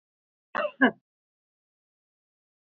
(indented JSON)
{
  "cough_length": "2.6 s",
  "cough_amplitude": 11955,
  "cough_signal_mean_std_ratio": 0.21,
  "survey_phase": "beta (2021-08-13 to 2022-03-07)",
  "age": "65+",
  "gender": "Female",
  "wearing_mask": "No",
  "symptom_none": true,
  "smoker_status": "Ex-smoker",
  "respiratory_condition_asthma": false,
  "respiratory_condition_other": false,
  "recruitment_source": "REACT",
  "submission_delay": "5 days",
  "covid_test_result": "Negative",
  "covid_test_method": "RT-qPCR",
  "influenza_a_test_result": "Negative",
  "influenza_b_test_result": "Negative"
}